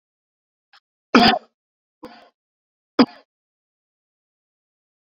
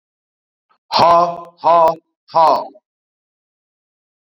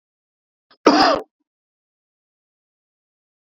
{"three_cough_length": "5.0 s", "three_cough_amplitude": 32767, "three_cough_signal_mean_std_ratio": 0.19, "exhalation_length": "4.4 s", "exhalation_amplitude": 28509, "exhalation_signal_mean_std_ratio": 0.39, "cough_length": "3.4 s", "cough_amplitude": 27081, "cough_signal_mean_std_ratio": 0.24, "survey_phase": "beta (2021-08-13 to 2022-03-07)", "age": "45-64", "gender": "Male", "wearing_mask": "No", "symptom_none": true, "smoker_status": "Current smoker (11 or more cigarettes per day)", "respiratory_condition_asthma": false, "respiratory_condition_other": false, "recruitment_source": "REACT", "submission_delay": "0 days", "covid_test_result": "Negative", "covid_test_method": "RT-qPCR"}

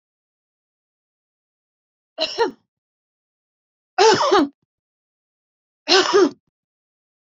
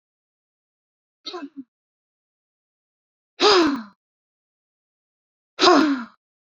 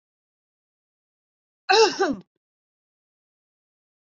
{"three_cough_length": "7.3 s", "three_cough_amplitude": 26562, "three_cough_signal_mean_std_ratio": 0.3, "exhalation_length": "6.6 s", "exhalation_amplitude": 28200, "exhalation_signal_mean_std_ratio": 0.29, "cough_length": "4.0 s", "cough_amplitude": 17747, "cough_signal_mean_std_ratio": 0.24, "survey_phase": "beta (2021-08-13 to 2022-03-07)", "age": "45-64", "gender": "Female", "wearing_mask": "No", "symptom_none": true, "smoker_status": "Current smoker (e-cigarettes or vapes only)", "respiratory_condition_asthma": false, "respiratory_condition_other": false, "recruitment_source": "REACT", "submission_delay": "1 day", "covid_test_result": "Negative", "covid_test_method": "RT-qPCR"}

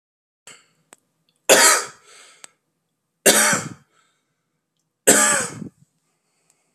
{"three_cough_length": "6.7 s", "three_cough_amplitude": 32768, "three_cough_signal_mean_std_ratio": 0.32, "survey_phase": "beta (2021-08-13 to 2022-03-07)", "age": "18-44", "gender": "Male", "wearing_mask": "No", "symptom_runny_or_blocked_nose": true, "smoker_status": "Current smoker (1 to 10 cigarettes per day)", "respiratory_condition_asthma": false, "respiratory_condition_other": false, "recruitment_source": "Test and Trace", "submission_delay": "1 day", "covid_test_result": "Positive", "covid_test_method": "RT-qPCR", "covid_ct_value": 25.5, "covid_ct_gene": "ORF1ab gene", "covid_ct_mean": 26.4, "covid_viral_load": "2200 copies/ml", "covid_viral_load_category": "Minimal viral load (< 10K copies/ml)"}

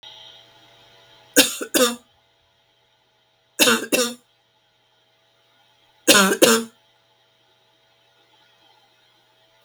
{"three_cough_length": "9.6 s", "three_cough_amplitude": 32768, "three_cough_signal_mean_std_ratio": 0.29, "survey_phase": "beta (2021-08-13 to 2022-03-07)", "age": "65+", "gender": "Female", "wearing_mask": "No", "symptom_none": true, "smoker_status": "Ex-smoker", "respiratory_condition_asthma": false, "respiratory_condition_other": false, "recruitment_source": "REACT", "submission_delay": "2 days", "covid_test_result": "Negative", "covid_test_method": "RT-qPCR"}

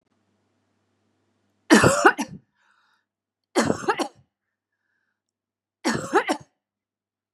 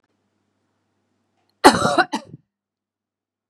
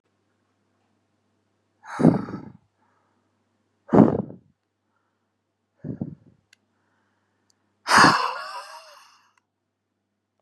{"three_cough_length": "7.3 s", "three_cough_amplitude": 31724, "three_cough_signal_mean_std_ratio": 0.29, "cough_length": "3.5 s", "cough_amplitude": 32768, "cough_signal_mean_std_ratio": 0.23, "exhalation_length": "10.4 s", "exhalation_amplitude": 27900, "exhalation_signal_mean_std_ratio": 0.24, "survey_phase": "beta (2021-08-13 to 2022-03-07)", "age": "45-64", "gender": "Female", "wearing_mask": "No", "symptom_none": true, "symptom_onset": "8 days", "smoker_status": "Ex-smoker", "respiratory_condition_asthma": false, "respiratory_condition_other": false, "recruitment_source": "REACT", "submission_delay": "2 days", "covid_test_result": "Negative", "covid_test_method": "RT-qPCR", "influenza_a_test_result": "Negative", "influenza_b_test_result": "Negative"}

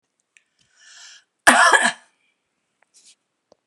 {"cough_length": "3.7 s", "cough_amplitude": 32768, "cough_signal_mean_std_ratio": 0.27, "survey_phase": "beta (2021-08-13 to 2022-03-07)", "age": "65+", "gender": "Female", "wearing_mask": "No", "symptom_runny_or_blocked_nose": true, "symptom_onset": "9 days", "smoker_status": "Ex-smoker", "respiratory_condition_asthma": false, "respiratory_condition_other": false, "recruitment_source": "REACT", "submission_delay": "1 day", "covid_test_result": "Negative", "covid_test_method": "RT-qPCR", "influenza_a_test_result": "Negative", "influenza_b_test_result": "Negative"}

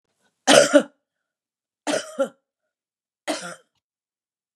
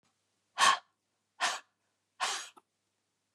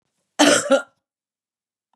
{"three_cough_length": "4.6 s", "three_cough_amplitude": 32677, "three_cough_signal_mean_std_ratio": 0.27, "exhalation_length": "3.3 s", "exhalation_amplitude": 8162, "exhalation_signal_mean_std_ratio": 0.29, "cough_length": "2.0 s", "cough_amplitude": 26741, "cough_signal_mean_std_ratio": 0.35, "survey_phase": "beta (2021-08-13 to 2022-03-07)", "age": "65+", "gender": "Female", "wearing_mask": "No", "symptom_cough_any": true, "smoker_status": "Ex-smoker", "respiratory_condition_asthma": false, "respiratory_condition_other": false, "recruitment_source": "REACT", "submission_delay": "1 day", "covid_test_result": "Negative", "covid_test_method": "RT-qPCR", "influenza_a_test_result": "Negative", "influenza_b_test_result": "Negative"}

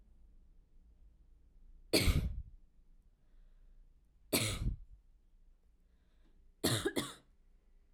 {"three_cough_length": "7.9 s", "three_cough_amplitude": 5296, "three_cough_signal_mean_std_ratio": 0.36, "survey_phase": "beta (2021-08-13 to 2022-03-07)", "age": "18-44", "gender": "Female", "wearing_mask": "No", "symptom_none": true, "smoker_status": "Never smoked", "respiratory_condition_asthma": false, "respiratory_condition_other": false, "recruitment_source": "REACT", "submission_delay": "3 days", "covid_test_result": "Negative", "covid_test_method": "RT-qPCR", "influenza_a_test_result": "Negative", "influenza_b_test_result": "Negative"}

